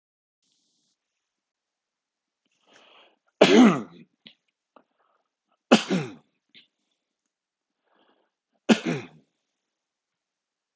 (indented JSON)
{
  "three_cough_length": "10.8 s",
  "three_cough_amplitude": 28999,
  "three_cough_signal_mean_std_ratio": 0.21,
  "survey_phase": "beta (2021-08-13 to 2022-03-07)",
  "age": "45-64",
  "gender": "Male",
  "wearing_mask": "No",
  "symptom_none": true,
  "symptom_onset": "6 days",
  "smoker_status": "Ex-smoker",
  "respiratory_condition_asthma": true,
  "respiratory_condition_other": false,
  "recruitment_source": "REACT",
  "submission_delay": "3 days",
  "covid_test_result": "Negative",
  "covid_test_method": "RT-qPCR"
}